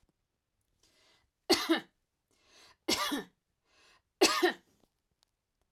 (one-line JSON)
{"three_cough_length": "5.7 s", "three_cough_amplitude": 8561, "three_cough_signal_mean_std_ratio": 0.3, "survey_phase": "alpha (2021-03-01 to 2021-08-12)", "age": "45-64", "gender": "Female", "wearing_mask": "No", "symptom_none": true, "smoker_status": "Never smoked", "respiratory_condition_asthma": false, "respiratory_condition_other": false, "recruitment_source": "REACT", "submission_delay": "4 days", "covid_test_result": "Negative", "covid_test_method": "RT-qPCR"}